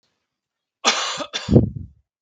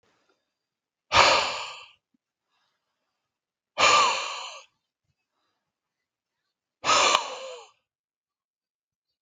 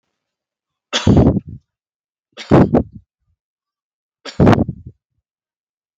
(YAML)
cough_length: 2.2 s
cough_amplitude: 32768
cough_signal_mean_std_ratio: 0.38
exhalation_length: 9.2 s
exhalation_amplitude: 32766
exhalation_signal_mean_std_ratio: 0.32
three_cough_length: 6.0 s
three_cough_amplitude: 32768
three_cough_signal_mean_std_ratio: 0.32
survey_phase: beta (2021-08-13 to 2022-03-07)
age: 18-44
gender: Male
wearing_mask: 'No'
symptom_none: true
smoker_status: Current smoker (1 to 10 cigarettes per day)
respiratory_condition_asthma: false
respiratory_condition_other: false
recruitment_source: REACT
submission_delay: 3 days
covid_test_result: Negative
covid_test_method: RT-qPCR
influenza_a_test_result: Negative
influenza_b_test_result: Negative